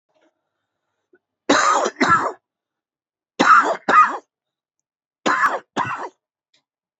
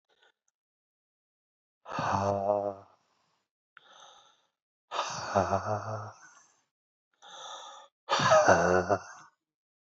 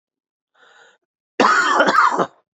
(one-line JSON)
{"three_cough_length": "7.0 s", "three_cough_amplitude": 26459, "three_cough_signal_mean_std_ratio": 0.4, "exhalation_length": "9.9 s", "exhalation_amplitude": 14341, "exhalation_signal_mean_std_ratio": 0.4, "cough_length": "2.6 s", "cough_amplitude": 27910, "cough_signal_mean_std_ratio": 0.49, "survey_phase": "beta (2021-08-13 to 2022-03-07)", "age": "45-64", "gender": "Male", "wearing_mask": "No", "symptom_cough_any": true, "symptom_sore_throat": true, "symptom_fatigue": true, "symptom_headache": true, "symptom_onset": "4 days", "smoker_status": "Never smoked", "respiratory_condition_asthma": true, "respiratory_condition_other": false, "recruitment_source": "Test and Trace", "submission_delay": "2 days", "covid_test_result": "Positive", "covid_test_method": "RT-qPCR"}